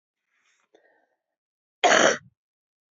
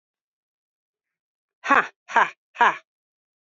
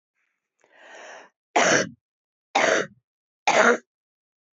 {
  "cough_length": "2.9 s",
  "cough_amplitude": 20502,
  "cough_signal_mean_std_ratio": 0.26,
  "exhalation_length": "3.4 s",
  "exhalation_amplitude": 24451,
  "exhalation_signal_mean_std_ratio": 0.26,
  "three_cough_length": "4.5 s",
  "three_cough_amplitude": 21199,
  "three_cough_signal_mean_std_ratio": 0.37,
  "survey_phase": "beta (2021-08-13 to 2022-03-07)",
  "age": "45-64",
  "gender": "Female",
  "wearing_mask": "No",
  "symptom_runny_or_blocked_nose": true,
  "symptom_sore_throat": true,
  "symptom_onset": "3 days",
  "smoker_status": "Never smoked",
  "respiratory_condition_asthma": false,
  "respiratory_condition_other": false,
  "recruitment_source": "Test and Trace",
  "submission_delay": "1 day",
  "covid_test_result": "Positive",
  "covid_test_method": "RT-qPCR",
  "covid_ct_value": 15.6,
  "covid_ct_gene": "N gene"
}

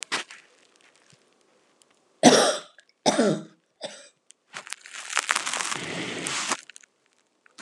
{
  "cough_length": "7.6 s",
  "cough_amplitude": 31381,
  "cough_signal_mean_std_ratio": 0.34,
  "survey_phase": "alpha (2021-03-01 to 2021-08-12)",
  "age": "65+",
  "gender": "Female",
  "wearing_mask": "No",
  "symptom_none": true,
  "smoker_status": "Ex-smoker",
  "respiratory_condition_asthma": false,
  "respiratory_condition_other": false,
  "recruitment_source": "REACT",
  "submission_delay": "2 days",
  "covid_test_result": "Negative",
  "covid_test_method": "RT-qPCR"
}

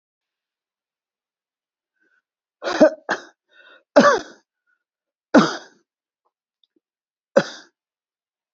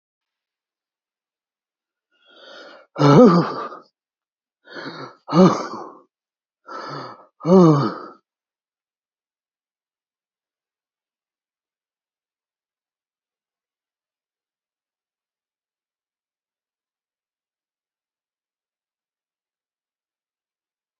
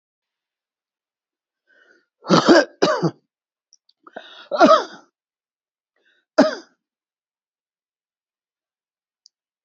{
  "three_cough_length": "8.5 s",
  "three_cough_amplitude": 32768,
  "three_cough_signal_mean_std_ratio": 0.22,
  "exhalation_length": "21.0 s",
  "exhalation_amplitude": 27802,
  "exhalation_signal_mean_std_ratio": 0.21,
  "cough_length": "9.6 s",
  "cough_amplitude": 31050,
  "cough_signal_mean_std_ratio": 0.25,
  "survey_phase": "beta (2021-08-13 to 2022-03-07)",
  "age": "65+",
  "gender": "Male",
  "wearing_mask": "No",
  "symptom_none": true,
  "smoker_status": "Current smoker (1 to 10 cigarettes per day)",
  "respiratory_condition_asthma": false,
  "respiratory_condition_other": false,
  "recruitment_source": "REACT",
  "submission_delay": "2 days",
  "covid_test_result": "Negative",
  "covid_test_method": "RT-qPCR",
  "influenza_a_test_result": "Negative",
  "influenza_b_test_result": "Negative"
}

